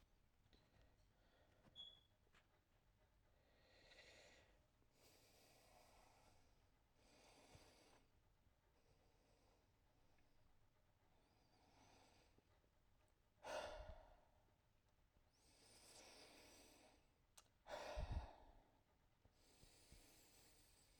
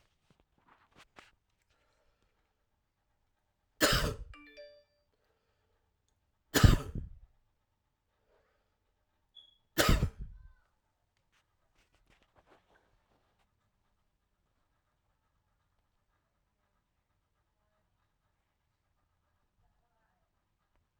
{"exhalation_length": "21.0 s", "exhalation_amplitude": 430, "exhalation_signal_mean_std_ratio": 0.41, "three_cough_length": "21.0 s", "three_cough_amplitude": 12425, "three_cough_signal_mean_std_ratio": 0.17, "survey_phase": "alpha (2021-03-01 to 2021-08-12)", "age": "45-64", "gender": "Male", "wearing_mask": "Yes", "symptom_none": true, "smoker_status": "Never smoked", "respiratory_condition_asthma": false, "respiratory_condition_other": false, "recruitment_source": "REACT", "submission_delay": "1 day", "covid_test_result": "Negative", "covid_test_method": "RT-qPCR"}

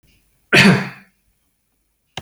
{"cough_length": "2.2 s", "cough_amplitude": 32152, "cough_signal_mean_std_ratio": 0.32, "survey_phase": "beta (2021-08-13 to 2022-03-07)", "age": "45-64", "gender": "Male", "wearing_mask": "No", "symptom_none": true, "smoker_status": "Never smoked", "respiratory_condition_asthma": false, "respiratory_condition_other": false, "recruitment_source": "REACT", "submission_delay": "0 days", "covid_test_result": "Negative", "covid_test_method": "RT-qPCR"}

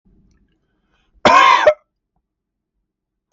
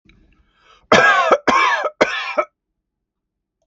{"cough_length": "3.3 s", "cough_amplitude": 32768, "cough_signal_mean_std_ratio": 0.31, "three_cough_length": "3.7 s", "three_cough_amplitude": 32768, "three_cough_signal_mean_std_ratio": 0.46, "survey_phase": "beta (2021-08-13 to 2022-03-07)", "age": "18-44", "gender": "Male", "wearing_mask": "No", "symptom_none": true, "smoker_status": "Never smoked", "respiratory_condition_asthma": false, "respiratory_condition_other": false, "recruitment_source": "REACT", "submission_delay": "1 day", "covid_test_result": "Negative", "covid_test_method": "RT-qPCR", "influenza_a_test_result": "Unknown/Void", "influenza_b_test_result": "Unknown/Void"}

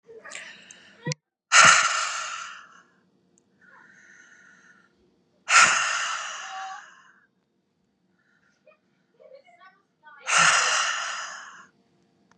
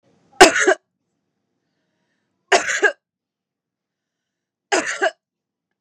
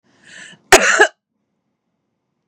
{"exhalation_length": "12.4 s", "exhalation_amplitude": 27551, "exhalation_signal_mean_std_ratio": 0.35, "three_cough_length": "5.8 s", "three_cough_amplitude": 32768, "three_cough_signal_mean_std_ratio": 0.27, "cough_length": "2.5 s", "cough_amplitude": 32768, "cough_signal_mean_std_ratio": 0.28, "survey_phase": "beta (2021-08-13 to 2022-03-07)", "age": "18-44", "gender": "Female", "wearing_mask": "No", "symptom_cough_any": true, "smoker_status": "Ex-smoker", "respiratory_condition_asthma": false, "respiratory_condition_other": false, "recruitment_source": "REACT", "submission_delay": "2 days", "covid_test_result": "Negative", "covid_test_method": "RT-qPCR", "influenza_a_test_result": "Negative", "influenza_b_test_result": "Negative"}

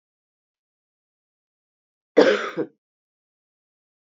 {"cough_length": "4.0 s", "cough_amplitude": 26676, "cough_signal_mean_std_ratio": 0.21, "survey_phase": "beta (2021-08-13 to 2022-03-07)", "age": "65+", "gender": "Female", "wearing_mask": "No", "symptom_cough_any": true, "symptom_runny_or_blocked_nose": true, "symptom_fatigue": true, "symptom_fever_high_temperature": true, "symptom_headache": true, "symptom_change_to_sense_of_smell_or_taste": true, "symptom_onset": "6 days", "smoker_status": "Never smoked", "respiratory_condition_asthma": false, "respiratory_condition_other": false, "recruitment_source": "Test and Trace", "submission_delay": "2 days", "covid_test_result": "Positive", "covid_test_method": "RT-qPCR"}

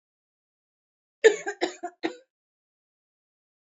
{"three_cough_length": "3.8 s", "three_cough_amplitude": 21615, "three_cough_signal_mean_std_ratio": 0.19, "survey_phase": "beta (2021-08-13 to 2022-03-07)", "age": "45-64", "gender": "Female", "wearing_mask": "No", "symptom_cough_any": true, "symptom_runny_or_blocked_nose": true, "smoker_status": "Never smoked", "respiratory_condition_asthma": false, "respiratory_condition_other": false, "recruitment_source": "Test and Trace", "submission_delay": "1 day", "covid_test_result": "Positive", "covid_test_method": "LFT"}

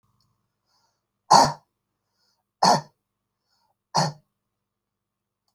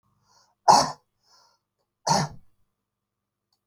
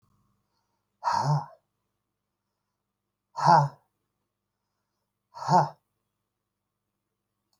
{"three_cough_length": "5.5 s", "three_cough_amplitude": 28890, "three_cough_signal_mean_std_ratio": 0.23, "cough_length": "3.7 s", "cough_amplitude": 25527, "cough_signal_mean_std_ratio": 0.25, "exhalation_length": "7.6 s", "exhalation_amplitude": 14631, "exhalation_signal_mean_std_ratio": 0.26, "survey_phase": "alpha (2021-03-01 to 2021-08-12)", "age": "65+", "gender": "Male", "wearing_mask": "No", "symptom_none": true, "smoker_status": "Ex-smoker", "respiratory_condition_asthma": true, "respiratory_condition_other": false, "recruitment_source": "REACT", "submission_delay": "1 day", "covid_test_result": "Negative", "covid_test_method": "RT-qPCR"}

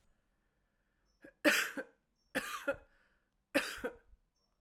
{"three_cough_length": "4.6 s", "three_cough_amplitude": 5246, "three_cough_signal_mean_std_ratio": 0.32, "survey_phase": "beta (2021-08-13 to 2022-03-07)", "age": "45-64", "gender": "Female", "wearing_mask": "No", "symptom_cough_any": true, "symptom_runny_or_blocked_nose": true, "symptom_shortness_of_breath": true, "symptom_fatigue": true, "symptom_headache": true, "symptom_loss_of_taste": true, "smoker_status": "Never smoked", "respiratory_condition_asthma": false, "respiratory_condition_other": false, "recruitment_source": "Test and Trace", "submission_delay": "2 days", "covid_test_result": "Positive", "covid_test_method": "LFT"}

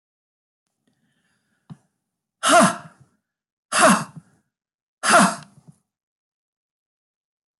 {"exhalation_length": "7.6 s", "exhalation_amplitude": 21293, "exhalation_signal_mean_std_ratio": 0.28, "survey_phase": "beta (2021-08-13 to 2022-03-07)", "age": "65+", "gender": "Female", "wearing_mask": "No", "symptom_cough_any": true, "symptom_fatigue": true, "smoker_status": "Ex-smoker", "respiratory_condition_asthma": false, "respiratory_condition_other": false, "recruitment_source": "REACT", "submission_delay": "2 days", "covid_test_result": "Negative", "covid_test_method": "RT-qPCR"}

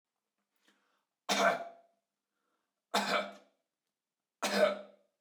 {"three_cough_length": "5.2 s", "three_cough_amplitude": 6367, "three_cough_signal_mean_std_ratio": 0.35, "survey_phase": "beta (2021-08-13 to 2022-03-07)", "age": "45-64", "gender": "Male", "wearing_mask": "No", "symptom_fatigue": true, "smoker_status": "Never smoked", "respiratory_condition_asthma": false, "respiratory_condition_other": false, "recruitment_source": "REACT", "submission_delay": "1 day", "covid_test_result": "Negative", "covid_test_method": "RT-qPCR"}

